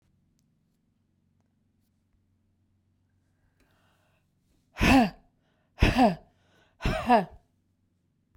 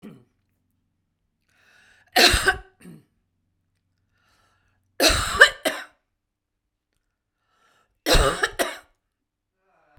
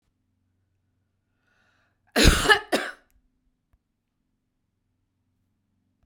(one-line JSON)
{"exhalation_length": "8.4 s", "exhalation_amplitude": 15564, "exhalation_signal_mean_std_ratio": 0.27, "three_cough_length": "10.0 s", "three_cough_amplitude": 32768, "three_cough_signal_mean_std_ratio": 0.28, "cough_length": "6.1 s", "cough_amplitude": 25147, "cough_signal_mean_std_ratio": 0.22, "survey_phase": "beta (2021-08-13 to 2022-03-07)", "age": "45-64", "gender": "Female", "wearing_mask": "No", "symptom_none": true, "smoker_status": "Never smoked", "respiratory_condition_asthma": false, "respiratory_condition_other": false, "recruitment_source": "REACT", "submission_delay": "1 day", "covid_test_result": "Negative", "covid_test_method": "RT-qPCR"}